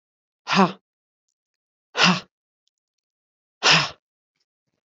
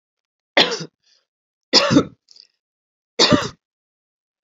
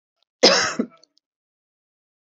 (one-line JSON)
{"exhalation_length": "4.9 s", "exhalation_amplitude": 27877, "exhalation_signal_mean_std_ratio": 0.28, "three_cough_length": "4.4 s", "three_cough_amplitude": 29876, "three_cough_signal_mean_std_ratio": 0.31, "cough_length": "2.2 s", "cough_amplitude": 32767, "cough_signal_mean_std_ratio": 0.29, "survey_phase": "beta (2021-08-13 to 2022-03-07)", "age": "45-64", "gender": "Female", "wearing_mask": "No", "symptom_runny_or_blocked_nose": true, "symptom_onset": "8 days", "smoker_status": "Never smoked", "respiratory_condition_asthma": false, "respiratory_condition_other": false, "recruitment_source": "REACT", "submission_delay": "2 days", "covid_test_result": "Negative", "covid_test_method": "RT-qPCR", "influenza_a_test_result": "Negative", "influenza_b_test_result": "Negative"}